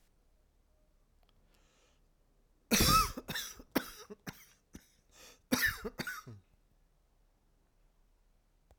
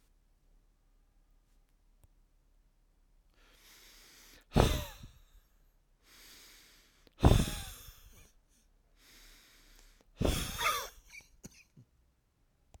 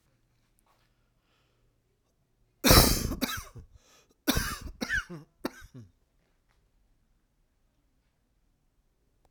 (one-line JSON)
{"cough_length": "8.8 s", "cough_amplitude": 6033, "cough_signal_mean_std_ratio": 0.29, "exhalation_length": "12.8 s", "exhalation_amplitude": 9961, "exhalation_signal_mean_std_ratio": 0.25, "three_cough_length": "9.3 s", "three_cough_amplitude": 22587, "three_cough_signal_mean_std_ratio": 0.25, "survey_phase": "alpha (2021-03-01 to 2021-08-12)", "age": "45-64", "gender": "Male", "wearing_mask": "No", "symptom_cough_any": true, "smoker_status": "Never smoked", "respiratory_condition_asthma": false, "respiratory_condition_other": false, "recruitment_source": "REACT", "submission_delay": "2 days", "covid_test_result": "Negative", "covid_test_method": "RT-qPCR"}